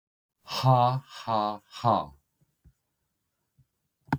{"exhalation_length": "4.2 s", "exhalation_amplitude": 12907, "exhalation_signal_mean_std_ratio": 0.37, "survey_phase": "beta (2021-08-13 to 2022-03-07)", "age": "45-64", "gender": "Male", "wearing_mask": "No", "symptom_cough_any": true, "symptom_runny_or_blocked_nose": true, "smoker_status": "Never smoked", "respiratory_condition_asthma": false, "respiratory_condition_other": false, "recruitment_source": "REACT", "submission_delay": "1 day", "covid_test_result": "Negative", "covid_test_method": "RT-qPCR", "influenza_a_test_result": "Unknown/Void", "influenza_b_test_result": "Unknown/Void"}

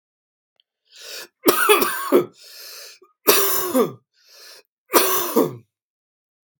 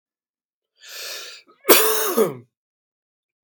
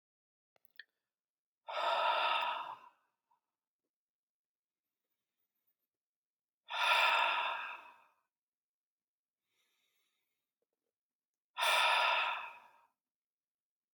{"three_cough_length": "6.6 s", "three_cough_amplitude": 32767, "three_cough_signal_mean_std_ratio": 0.43, "cough_length": "3.4 s", "cough_amplitude": 32768, "cough_signal_mean_std_ratio": 0.35, "exhalation_length": "13.9 s", "exhalation_amplitude": 4267, "exhalation_signal_mean_std_ratio": 0.37, "survey_phase": "beta (2021-08-13 to 2022-03-07)", "age": "18-44", "gender": "Male", "wearing_mask": "No", "symptom_cough_any": true, "symptom_onset": "12 days", "smoker_status": "Never smoked", "respiratory_condition_asthma": false, "respiratory_condition_other": false, "recruitment_source": "REACT", "submission_delay": "2 days", "covid_test_result": "Negative", "covid_test_method": "RT-qPCR", "influenza_a_test_result": "Negative", "influenza_b_test_result": "Negative"}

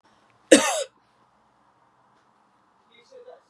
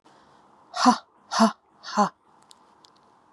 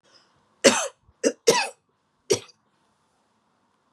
{"cough_length": "3.5 s", "cough_amplitude": 31805, "cough_signal_mean_std_ratio": 0.2, "exhalation_length": "3.3 s", "exhalation_amplitude": 23509, "exhalation_signal_mean_std_ratio": 0.31, "three_cough_length": "3.9 s", "three_cough_amplitude": 31251, "three_cough_signal_mean_std_ratio": 0.27, "survey_phase": "beta (2021-08-13 to 2022-03-07)", "age": "45-64", "gender": "Female", "wearing_mask": "No", "symptom_runny_or_blocked_nose": true, "smoker_status": "Never smoked", "respiratory_condition_asthma": false, "respiratory_condition_other": false, "recruitment_source": "REACT", "submission_delay": "1 day", "covid_test_result": "Negative", "covid_test_method": "RT-qPCR", "influenza_a_test_result": "Negative", "influenza_b_test_result": "Negative"}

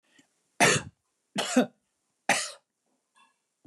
{"three_cough_length": "3.7 s", "three_cough_amplitude": 14815, "three_cough_signal_mean_std_ratio": 0.31, "survey_phase": "alpha (2021-03-01 to 2021-08-12)", "age": "65+", "gender": "Male", "wearing_mask": "No", "symptom_none": true, "smoker_status": "Never smoked", "respiratory_condition_asthma": false, "respiratory_condition_other": false, "recruitment_source": "REACT", "submission_delay": "3 days", "covid_test_result": "Negative", "covid_test_method": "RT-qPCR"}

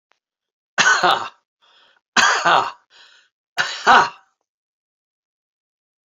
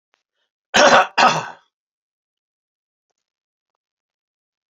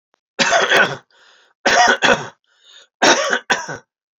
{"exhalation_length": "6.1 s", "exhalation_amplitude": 30427, "exhalation_signal_mean_std_ratio": 0.35, "cough_length": "4.8 s", "cough_amplitude": 29385, "cough_signal_mean_std_ratio": 0.26, "three_cough_length": "4.2 s", "three_cough_amplitude": 32767, "three_cough_signal_mean_std_ratio": 0.51, "survey_phase": "beta (2021-08-13 to 2022-03-07)", "age": "65+", "gender": "Male", "wearing_mask": "No", "symptom_none": true, "smoker_status": "Never smoked", "respiratory_condition_asthma": false, "respiratory_condition_other": false, "recruitment_source": "REACT", "submission_delay": "5 days", "covid_test_result": "Negative", "covid_test_method": "RT-qPCR"}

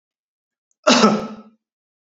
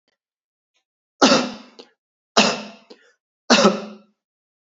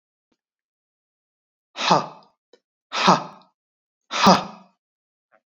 {"cough_length": "2.0 s", "cough_amplitude": 29927, "cough_signal_mean_std_ratio": 0.34, "three_cough_length": "4.7 s", "three_cough_amplitude": 32767, "three_cough_signal_mean_std_ratio": 0.32, "exhalation_length": "5.5 s", "exhalation_amplitude": 27276, "exhalation_signal_mean_std_ratio": 0.28, "survey_phase": "beta (2021-08-13 to 2022-03-07)", "age": "18-44", "gender": "Male", "wearing_mask": "No", "symptom_none": true, "smoker_status": "Never smoked", "respiratory_condition_asthma": true, "respiratory_condition_other": false, "recruitment_source": "REACT", "submission_delay": "1 day", "covid_test_result": "Negative", "covid_test_method": "RT-qPCR"}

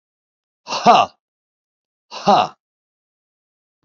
{"exhalation_length": "3.8 s", "exhalation_amplitude": 32767, "exhalation_signal_mean_std_ratio": 0.28, "survey_phase": "alpha (2021-03-01 to 2021-08-12)", "age": "65+", "gender": "Male", "wearing_mask": "No", "symptom_cough_any": true, "smoker_status": "Ex-smoker", "respiratory_condition_asthma": false, "respiratory_condition_other": false, "recruitment_source": "REACT", "submission_delay": "1 day", "covid_test_result": "Negative", "covid_test_method": "RT-qPCR"}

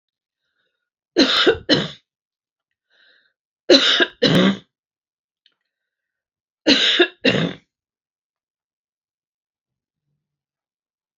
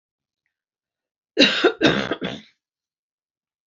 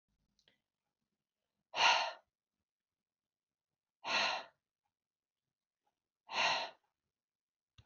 {"three_cough_length": "11.2 s", "three_cough_amplitude": 30514, "three_cough_signal_mean_std_ratio": 0.32, "cough_length": "3.7 s", "cough_amplitude": 28362, "cough_signal_mean_std_ratio": 0.33, "exhalation_length": "7.9 s", "exhalation_amplitude": 4884, "exhalation_signal_mean_std_ratio": 0.28, "survey_phase": "beta (2021-08-13 to 2022-03-07)", "age": "65+", "gender": "Female", "wearing_mask": "No", "symptom_none": true, "smoker_status": "Never smoked", "respiratory_condition_asthma": false, "respiratory_condition_other": false, "recruitment_source": "REACT", "submission_delay": "1 day", "covid_test_result": "Negative", "covid_test_method": "RT-qPCR", "influenza_a_test_result": "Negative", "influenza_b_test_result": "Negative"}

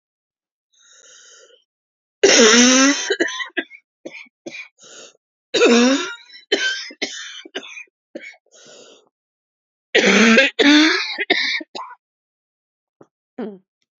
{"cough_length": "14.0 s", "cough_amplitude": 32767, "cough_signal_mean_std_ratio": 0.42, "survey_phase": "beta (2021-08-13 to 2022-03-07)", "age": "18-44", "gender": "Female", "wearing_mask": "No", "symptom_cough_any": true, "symptom_new_continuous_cough": true, "symptom_runny_or_blocked_nose": true, "symptom_shortness_of_breath": true, "symptom_sore_throat": true, "symptom_fatigue": true, "symptom_headache": true, "symptom_onset": "7 days", "smoker_status": "Never smoked", "respiratory_condition_asthma": true, "respiratory_condition_other": false, "recruitment_source": "Test and Trace", "submission_delay": "1 day", "covid_test_result": "Positive", "covid_test_method": "ePCR"}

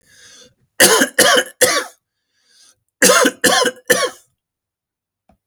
{"cough_length": "5.5 s", "cough_amplitude": 32768, "cough_signal_mean_std_ratio": 0.43, "survey_phase": "alpha (2021-03-01 to 2021-08-12)", "age": "65+", "gender": "Male", "wearing_mask": "No", "symptom_none": true, "smoker_status": "Never smoked", "respiratory_condition_asthma": false, "respiratory_condition_other": false, "recruitment_source": "REACT", "submission_delay": "3 days", "covid_test_result": "Negative", "covid_test_method": "RT-qPCR"}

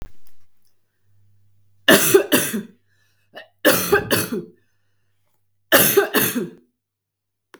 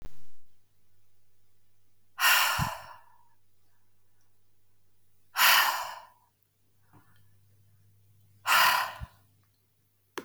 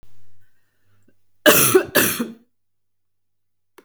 {"three_cough_length": "7.6 s", "three_cough_amplitude": 32768, "three_cough_signal_mean_std_ratio": 0.41, "exhalation_length": "10.2 s", "exhalation_amplitude": 13030, "exhalation_signal_mean_std_ratio": 0.38, "cough_length": "3.8 s", "cough_amplitude": 32768, "cough_signal_mean_std_ratio": 0.36, "survey_phase": "beta (2021-08-13 to 2022-03-07)", "age": "45-64", "gender": "Female", "wearing_mask": "No", "symptom_none": true, "smoker_status": "Ex-smoker", "respiratory_condition_asthma": false, "respiratory_condition_other": false, "recruitment_source": "REACT", "submission_delay": "0 days", "covid_test_result": "Negative", "covid_test_method": "RT-qPCR", "influenza_a_test_result": "Negative", "influenza_b_test_result": "Negative"}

